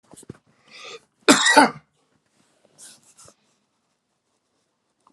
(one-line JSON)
{"cough_length": "5.1 s", "cough_amplitude": 32036, "cough_signal_mean_std_ratio": 0.23, "survey_phase": "alpha (2021-03-01 to 2021-08-12)", "age": "45-64", "gender": "Male", "wearing_mask": "No", "symptom_none": true, "smoker_status": "Ex-smoker", "respiratory_condition_asthma": false, "respiratory_condition_other": false, "recruitment_source": "REACT", "submission_delay": "2 days", "covid_test_result": "Negative", "covid_test_method": "RT-qPCR"}